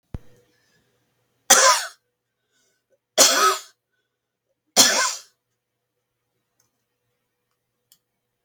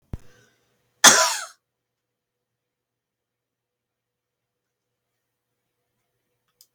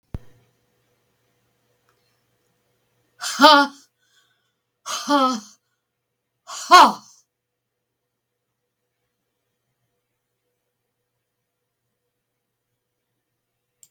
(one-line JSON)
{"three_cough_length": "8.4 s", "three_cough_amplitude": 32768, "three_cough_signal_mean_std_ratio": 0.28, "cough_length": "6.7 s", "cough_amplitude": 32768, "cough_signal_mean_std_ratio": 0.16, "exhalation_length": "13.9 s", "exhalation_amplitude": 32768, "exhalation_signal_mean_std_ratio": 0.19, "survey_phase": "beta (2021-08-13 to 2022-03-07)", "age": "65+", "gender": "Female", "wearing_mask": "No", "symptom_none": true, "smoker_status": "Ex-smoker", "respiratory_condition_asthma": false, "respiratory_condition_other": false, "recruitment_source": "REACT", "submission_delay": "1 day", "covid_test_result": "Negative", "covid_test_method": "RT-qPCR", "influenza_a_test_result": "Negative", "influenza_b_test_result": "Negative"}